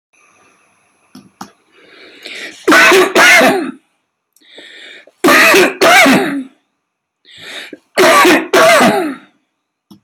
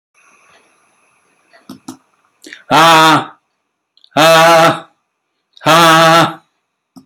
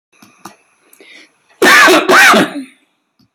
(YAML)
three_cough_length: 10.0 s
three_cough_amplitude: 32768
three_cough_signal_mean_std_ratio: 0.53
exhalation_length: 7.1 s
exhalation_amplitude: 32767
exhalation_signal_mean_std_ratio: 0.47
cough_length: 3.3 s
cough_amplitude: 32768
cough_signal_mean_std_ratio: 0.49
survey_phase: beta (2021-08-13 to 2022-03-07)
age: 65+
gender: Male
wearing_mask: 'No'
symptom_none: true
smoker_status: Ex-smoker
respiratory_condition_asthma: false
respiratory_condition_other: false
recruitment_source: REACT
submission_delay: 1 day
covid_test_result: Negative
covid_test_method: RT-qPCR